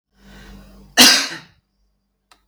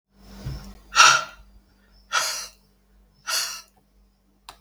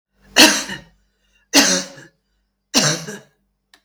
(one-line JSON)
{"cough_length": "2.5 s", "cough_amplitude": 32768, "cough_signal_mean_std_ratio": 0.29, "exhalation_length": "4.6 s", "exhalation_amplitude": 32768, "exhalation_signal_mean_std_ratio": 0.32, "three_cough_length": "3.8 s", "three_cough_amplitude": 32768, "three_cough_signal_mean_std_ratio": 0.36, "survey_phase": "beta (2021-08-13 to 2022-03-07)", "age": "65+", "gender": "Female", "wearing_mask": "No", "symptom_none": true, "smoker_status": "Ex-smoker", "respiratory_condition_asthma": false, "respiratory_condition_other": false, "recruitment_source": "REACT", "submission_delay": "4 days", "covid_test_result": "Negative", "covid_test_method": "RT-qPCR", "influenza_a_test_result": "Unknown/Void", "influenza_b_test_result": "Unknown/Void"}